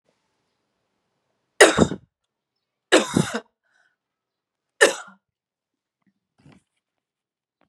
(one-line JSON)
{"three_cough_length": "7.7 s", "three_cough_amplitude": 32767, "three_cough_signal_mean_std_ratio": 0.21, "survey_phase": "beta (2021-08-13 to 2022-03-07)", "age": "18-44", "gender": "Female", "wearing_mask": "No", "symptom_cough_any": true, "symptom_sore_throat": true, "symptom_other": true, "symptom_onset": "6 days", "smoker_status": "Never smoked", "respiratory_condition_asthma": false, "respiratory_condition_other": false, "recruitment_source": "Test and Trace", "submission_delay": "1 day", "covid_test_result": "Positive", "covid_test_method": "RT-qPCR", "covid_ct_value": 19.8, "covid_ct_gene": "ORF1ab gene", "covid_ct_mean": 20.1, "covid_viral_load": "260000 copies/ml", "covid_viral_load_category": "Low viral load (10K-1M copies/ml)"}